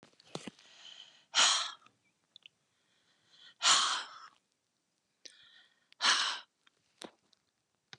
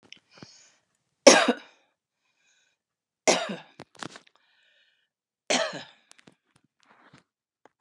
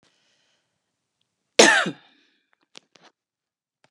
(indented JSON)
{
  "exhalation_length": "8.0 s",
  "exhalation_amplitude": 8246,
  "exhalation_signal_mean_std_ratio": 0.31,
  "three_cough_length": "7.8 s",
  "three_cough_amplitude": 32767,
  "three_cough_signal_mean_std_ratio": 0.2,
  "cough_length": "3.9 s",
  "cough_amplitude": 32532,
  "cough_signal_mean_std_ratio": 0.2,
  "survey_phase": "beta (2021-08-13 to 2022-03-07)",
  "age": "65+",
  "gender": "Female",
  "wearing_mask": "No",
  "symptom_none": true,
  "smoker_status": "Never smoked",
  "respiratory_condition_asthma": false,
  "respiratory_condition_other": false,
  "recruitment_source": "REACT",
  "submission_delay": "2 days",
  "covid_test_result": "Negative",
  "covid_test_method": "RT-qPCR",
  "influenza_a_test_result": "Negative",
  "influenza_b_test_result": "Negative"
}